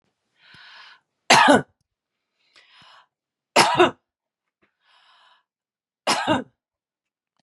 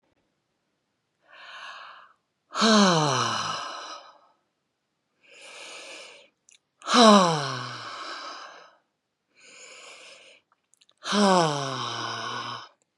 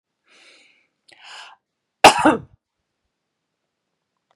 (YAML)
three_cough_length: 7.4 s
three_cough_amplitude: 30730
three_cough_signal_mean_std_ratio: 0.27
exhalation_length: 13.0 s
exhalation_amplitude: 25219
exhalation_signal_mean_std_ratio: 0.38
cough_length: 4.4 s
cough_amplitude: 32768
cough_signal_mean_std_ratio: 0.19
survey_phase: beta (2021-08-13 to 2022-03-07)
age: 65+
gender: Female
wearing_mask: 'No'
symptom_none: true
smoker_status: Never smoked
respiratory_condition_asthma: false
respiratory_condition_other: false
recruitment_source: REACT
submission_delay: 1 day
covid_test_result: Negative
covid_test_method: RT-qPCR
influenza_a_test_result: Negative
influenza_b_test_result: Negative